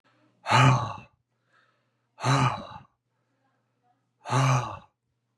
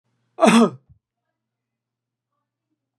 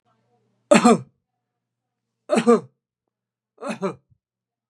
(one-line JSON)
{"exhalation_length": "5.4 s", "exhalation_amplitude": 13176, "exhalation_signal_mean_std_ratio": 0.39, "cough_length": "3.0 s", "cough_amplitude": 31097, "cough_signal_mean_std_ratio": 0.25, "three_cough_length": "4.7 s", "three_cough_amplitude": 32134, "three_cough_signal_mean_std_ratio": 0.28, "survey_phase": "beta (2021-08-13 to 2022-03-07)", "age": "65+", "gender": "Male", "wearing_mask": "No", "symptom_none": true, "smoker_status": "Ex-smoker", "respiratory_condition_asthma": false, "respiratory_condition_other": false, "recruitment_source": "REACT", "submission_delay": "2 days", "covid_test_result": "Negative", "covid_test_method": "RT-qPCR"}